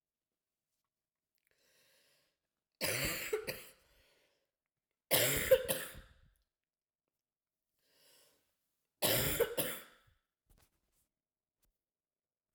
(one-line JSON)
{"three_cough_length": "12.5 s", "three_cough_amplitude": 5254, "three_cough_signal_mean_std_ratio": 0.3, "survey_phase": "beta (2021-08-13 to 2022-03-07)", "age": "45-64", "gender": "Female", "wearing_mask": "No", "symptom_cough_any": true, "symptom_runny_or_blocked_nose": true, "symptom_shortness_of_breath": true, "symptom_fatigue": true, "symptom_fever_high_temperature": true, "symptom_headache": true, "symptom_change_to_sense_of_smell_or_taste": true, "symptom_loss_of_taste": true, "smoker_status": "Never smoked", "respiratory_condition_asthma": true, "respiratory_condition_other": false, "recruitment_source": "Test and Trace", "submission_delay": "2 days", "covid_test_result": "Positive", "covid_test_method": "RT-qPCR"}